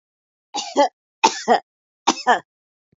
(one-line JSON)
{"cough_length": "3.0 s", "cough_amplitude": 29460, "cough_signal_mean_std_ratio": 0.35, "survey_phase": "beta (2021-08-13 to 2022-03-07)", "age": "65+", "gender": "Female", "wearing_mask": "No", "symptom_none": true, "smoker_status": "Never smoked", "respiratory_condition_asthma": false, "respiratory_condition_other": false, "recruitment_source": "REACT", "submission_delay": "2 days", "covid_test_result": "Negative", "covid_test_method": "RT-qPCR", "influenza_a_test_result": "Negative", "influenza_b_test_result": "Negative"}